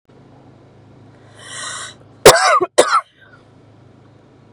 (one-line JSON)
{"cough_length": "4.5 s", "cough_amplitude": 32768, "cough_signal_mean_std_ratio": 0.31, "survey_phase": "beta (2021-08-13 to 2022-03-07)", "age": "18-44", "gender": "Female", "wearing_mask": "No", "symptom_none": true, "smoker_status": "Current smoker (e-cigarettes or vapes only)", "respiratory_condition_asthma": false, "respiratory_condition_other": false, "recruitment_source": "REACT", "submission_delay": "0 days", "covid_test_result": "Negative", "covid_test_method": "RT-qPCR", "influenza_a_test_result": "Negative", "influenza_b_test_result": "Negative"}